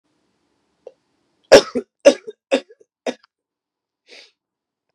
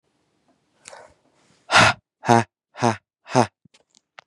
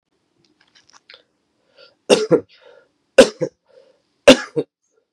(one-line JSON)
{"cough_length": "4.9 s", "cough_amplitude": 32768, "cough_signal_mean_std_ratio": 0.19, "exhalation_length": "4.3 s", "exhalation_amplitude": 32767, "exhalation_signal_mean_std_ratio": 0.27, "three_cough_length": "5.1 s", "three_cough_amplitude": 32768, "three_cough_signal_mean_std_ratio": 0.23, "survey_phase": "beta (2021-08-13 to 2022-03-07)", "age": "18-44", "gender": "Male", "wearing_mask": "No", "symptom_cough_any": true, "symptom_new_continuous_cough": true, "symptom_runny_or_blocked_nose": true, "symptom_sore_throat": true, "symptom_fatigue": true, "symptom_fever_high_temperature": true, "symptom_headache": true, "symptom_change_to_sense_of_smell_or_taste": true, "symptom_loss_of_taste": true, "symptom_onset": "3 days", "smoker_status": "Never smoked", "respiratory_condition_asthma": false, "respiratory_condition_other": false, "recruitment_source": "Test and Trace", "submission_delay": "2 days", "covid_test_result": "Positive", "covid_test_method": "ePCR"}